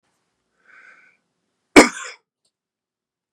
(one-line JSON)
{"cough_length": "3.3 s", "cough_amplitude": 32768, "cough_signal_mean_std_ratio": 0.15, "survey_phase": "beta (2021-08-13 to 2022-03-07)", "age": "45-64", "gender": "Male", "wearing_mask": "No", "symptom_headache": true, "smoker_status": "Never smoked", "respiratory_condition_asthma": false, "respiratory_condition_other": false, "recruitment_source": "REACT", "submission_delay": "1 day", "covid_test_result": "Negative", "covid_test_method": "RT-qPCR"}